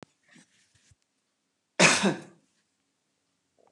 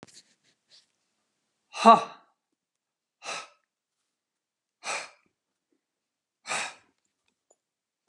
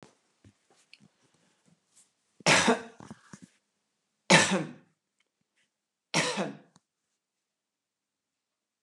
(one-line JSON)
{"cough_length": "3.7 s", "cough_amplitude": 18334, "cough_signal_mean_std_ratio": 0.24, "exhalation_length": "8.1 s", "exhalation_amplitude": 25336, "exhalation_signal_mean_std_ratio": 0.16, "three_cough_length": "8.8 s", "three_cough_amplitude": 17354, "three_cough_signal_mean_std_ratio": 0.25, "survey_phase": "beta (2021-08-13 to 2022-03-07)", "age": "45-64", "gender": "Female", "wearing_mask": "No", "symptom_none": true, "smoker_status": "Never smoked", "respiratory_condition_asthma": false, "respiratory_condition_other": false, "recruitment_source": "REACT", "submission_delay": "2 days", "covid_test_result": "Negative", "covid_test_method": "RT-qPCR"}